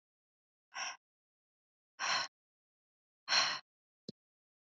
{"exhalation_length": "4.7 s", "exhalation_amplitude": 4996, "exhalation_signal_mean_std_ratio": 0.29, "survey_phase": "beta (2021-08-13 to 2022-03-07)", "age": "18-44", "gender": "Female", "wearing_mask": "No", "symptom_none": true, "symptom_onset": "12 days", "smoker_status": "Ex-smoker", "respiratory_condition_asthma": false, "respiratory_condition_other": false, "recruitment_source": "REACT", "submission_delay": "2 days", "covid_test_result": "Negative", "covid_test_method": "RT-qPCR", "influenza_a_test_result": "Negative", "influenza_b_test_result": "Negative"}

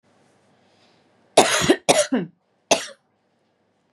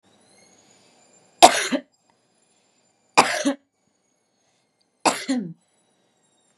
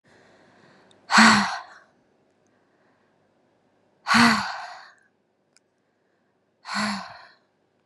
{"cough_length": "3.9 s", "cough_amplitude": 32057, "cough_signal_mean_std_ratio": 0.33, "three_cough_length": "6.6 s", "three_cough_amplitude": 32768, "three_cough_signal_mean_std_ratio": 0.24, "exhalation_length": "7.9 s", "exhalation_amplitude": 30693, "exhalation_signal_mean_std_ratio": 0.29, "survey_phase": "beta (2021-08-13 to 2022-03-07)", "age": "18-44", "gender": "Female", "wearing_mask": "No", "symptom_runny_or_blocked_nose": true, "symptom_fatigue": true, "smoker_status": "Ex-smoker", "respiratory_condition_asthma": false, "respiratory_condition_other": false, "recruitment_source": "REACT", "submission_delay": "1 day", "covid_test_result": "Negative", "covid_test_method": "RT-qPCR", "influenza_a_test_result": "Negative", "influenza_b_test_result": "Negative"}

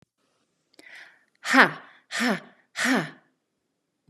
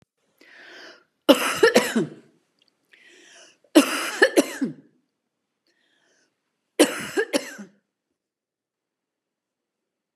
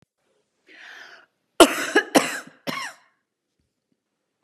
{"exhalation_length": "4.1 s", "exhalation_amplitude": 31791, "exhalation_signal_mean_std_ratio": 0.31, "three_cough_length": "10.2 s", "three_cough_amplitude": 31626, "three_cough_signal_mean_std_ratio": 0.28, "cough_length": "4.4 s", "cough_amplitude": 32768, "cough_signal_mean_std_ratio": 0.25, "survey_phase": "beta (2021-08-13 to 2022-03-07)", "age": "45-64", "gender": "Female", "wearing_mask": "No", "symptom_none": true, "smoker_status": "Never smoked", "respiratory_condition_asthma": true, "respiratory_condition_other": false, "recruitment_source": "REACT", "submission_delay": "6 days", "covid_test_result": "Negative", "covid_test_method": "RT-qPCR", "influenza_a_test_result": "Negative", "influenza_b_test_result": "Negative"}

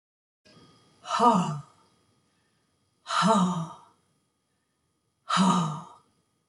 {"exhalation_length": "6.5 s", "exhalation_amplitude": 12574, "exhalation_signal_mean_std_ratio": 0.41, "survey_phase": "beta (2021-08-13 to 2022-03-07)", "age": "65+", "gender": "Female", "wearing_mask": "No", "symptom_none": true, "smoker_status": "Never smoked", "respiratory_condition_asthma": false, "respiratory_condition_other": false, "recruitment_source": "REACT", "submission_delay": "1 day", "covid_test_result": "Negative", "covid_test_method": "RT-qPCR"}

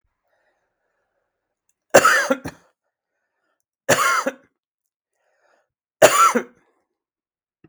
{"three_cough_length": "7.7 s", "three_cough_amplitude": 32768, "three_cough_signal_mean_std_ratio": 0.29, "survey_phase": "beta (2021-08-13 to 2022-03-07)", "age": "65+", "gender": "Male", "wearing_mask": "No", "symptom_none": true, "smoker_status": "Never smoked", "respiratory_condition_asthma": false, "respiratory_condition_other": false, "recruitment_source": "REACT", "submission_delay": "1 day", "covid_test_result": "Negative", "covid_test_method": "RT-qPCR"}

